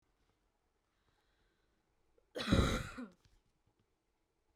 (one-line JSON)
{"cough_length": "4.6 s", "cough_amplitude": 4103, "cough_signal_mean_std_ratio": 0.26, "survey_phase": "beta (2021-08-13 to 2022-03-07)", "age": "18-44", "gender": "Female", "wearing_mask": "No", "symptom_runny_or_blocked_nose": true, "smoker_status": "Ex-smoker", "respiratory_condition_asthma": false, "respiratory_condition_other": false, "recruitment_source": "REACT", "submission_delay": "1 day", "covid_test_result": "Negative", "covid_test_method": "RT-qPCR", "influenza_a_test_result": "Unknown/Void", "influenza_b_test_result": "Unknown/Void"}